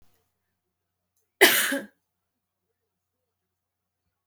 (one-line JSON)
{"cough_length": "4.3 s", "cough_amplitude": 32574, "cough_signal_mean_std_ratio": 0.21, "survey_phase": "alpha (2021-03-01 to 2021-08-12)", "age": "18-44", "gender": "Female", "wearing_mask": "No", "symptom_none": true, "symptom_onset": "13 days", "smoker_status": "Never smoked", "respiratory_condition_asthma": false, "respiratory_condition_other": false, "recruitment_source": "REACT", "submission_delay": "6 days", "covid_test_result": "Negative", "covid_test_method": "RT-qPCR"}